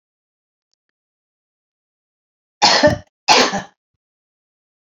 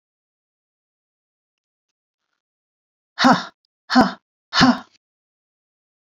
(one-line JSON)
{"cough_length": "4.9 s", "cough_amplitude": 31395, "cough_signal_mean_std_ratio": 0.28, "exhalation_length": "6.1 s", "exhalation_amplitude": 28675, "exhalation_signal_mean_std_ratio": 0.25, "survey_phase": "beta (2021-08-13 to 2022-03-07)", "age": "65+", "gender": "Female", "wearing_mask": "No", "symptom_none": true, "smoker_status": "Never smoked", "respiratory_condition_asthma": true, "respiratory_condition_other": false, "recruitment_source": "REACT", "submission_delay": "2 days", "covid_test_result": "Negative", "covid_test_method": "RT-qPCR", "covid_ct_value": 45.0, "covid_ct_gene": "N gene"}